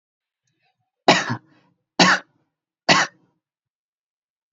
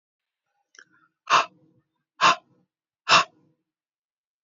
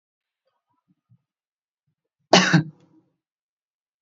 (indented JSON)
{
  "three_cough_length": "4.5 s",
  "three_cough_amplitude": 30792,
  "three_cough_signal_mean_std_ratio": 0.27,
  "exhalation_length": "4.4 s",
  "exhalation_amplitude": 21675,
  "exhalation_signal_mean_std_ratio": 0.24,
  "cough_length": "4.0 s",
  "cough_amplitude": 28618,
  "cough_signal_mean_std_ratio": 0.2,
  "survey_phase": "beta (2021-08-13 to 2022-03-07)",
  "age": "18-44",
  "gender": "Male",
  "wearing_mask": "No",
  "symptom_none": true,
  "smoker_status": "Never smoked",
  "respiratory_condition_asthma": false,
  "respiratory_condition_other": false,
  "recruitment_source": "REACT",
  "submission_delay": "2 days",
  "covid_test_result": "Negative",
  "covid_test_method": "RT-qPCR",
  "influenza_a_test_result": "Negative",
  "influenza_b_test_result": "Negative"
}